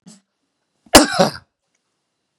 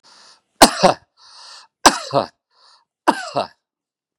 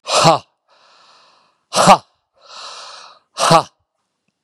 {"cough_length": "2.4 s", "cough_amplitude": 32768, "cough_signal_mean_std_ratio": 0.25, "three_cough_length": "4.2 s", "three_cough_amplitude": 32768, "three_cough_signal_mean_std_ratio": 0.27, "exhalation_length": "4.4 s", "exhalation_amplitude": 32768, "exhalation_signal_mean_std_ratio": 0.33, "survey_phase": "beta (2021-08-13 to 2022-03-07)", "age": "65+", "gender": "Male", "wearing_mask": "No", "symptom_sore_throat": true, "symptom_loss_of_taste": true, "smoker_status": "Never smoked", "respiratory_condition_asthma": true, "respiratory_condition_other": false, "recruitment_source": "REACT", "submission_delay": "0 days", "covid_test_result": "Negative", "covid_test_method": "RT-qPCR", "influenza_a_test_result": "Negative", "influenza_b_test_result": "Negative"}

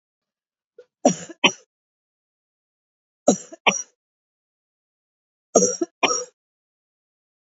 {"three_cough_length": "7.4 s", "three_cough_amplitude": 28813, "three_cough_signal_mean_std_ratio": 0.24, "survey_phase": "beta (2021-08-13 to 2022-03-07)", "age": "45-64", "gender": "Female", "wearing_mask": "No", "symptom_cough_any": true, "symptom_new_continuous_cough": true, "symptom_runny_or_blocked_nose": true, "symptom_headache": true, "smoker_status": "Never smoked", "respiratory_condition_asthma": false, "respiratory_condition_other": false, "recruitment_source": "Test and Trace", "submission_delay": "2 days", "covid_test_result": "Positive", "covid_test_method": "ePCR"}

